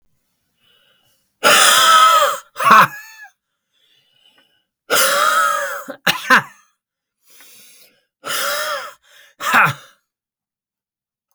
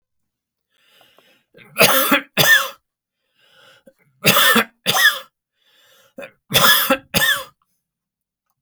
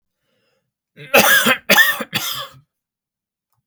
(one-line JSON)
{"exhalation_length": "11.3 s", "exhalation_amplitude": 32768, "exhalation_signal_mean_std_ratio": 0.42, "three_cough_length": "8.6 s", "three_cough_amplitude": 32768, "three_cough_signal_mean_std_ratio": 0.4, "cough_length": "3.7 s", "cough_amplitude": 32768, "cough_signal_mean_std_ratio": 0.4, "survey_phase": "beta (2021-08-13 to 2022-03-07)", "age": "65+", "gender": "Male", "wearing_mask": "No", "symptom_none": true, "smoker_status": "Never smoked", "respiratory_condition_asthma": false, "respiratory_condition_other": false, "recruitment_source": "REACT", "submission_delay": "1 day", "covid_test_result": "Negative", "covid_test_method": "RT-qPCR", "influenza_a_test_result": "Negative", "influenza_b_test_result": "Negative"}